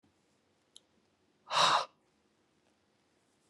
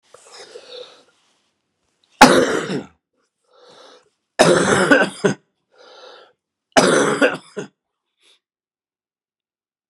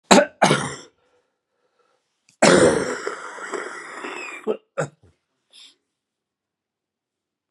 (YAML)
exhalation_length: 3.5 s
exhalation_amplitude: 6370
exhalation_signal_mean_std_ratio: 0.25
three_cough_length: 9.9 s
three_cough_amplitude: 32768
three_cough_signal_mean_std_ratio: 0.34
cough_length: 7.5 s
cough_amplitude: 32767
cough_signal_mean_std_ratio: 0.33
survey_phase: beta (2021-08-13 to 2022-03-07)
age: 65+
gender: Male
wearing_mask: 'No'
symptom_cough_any: true
symptom_runny_or_blocked_nose: true
symptom_other: true
symptom_onset: 6 days
smoker_status: Never smoked
respiratory_condition_asthma: false
respiratory_condition_other: false
recruitment_source: Test and Trace
submission_delay: 1 day
covid_test_result: Positive
covid_test_method: RT-qPCR
covid_ct_value: 20.3
covid_ct_gene: ORF1ab gene
covid_ct_mean: 21.6
covid_viral_load: 80000 copies/ml
covid_viral_load_category: Low viral load (10K-1M copies/ml)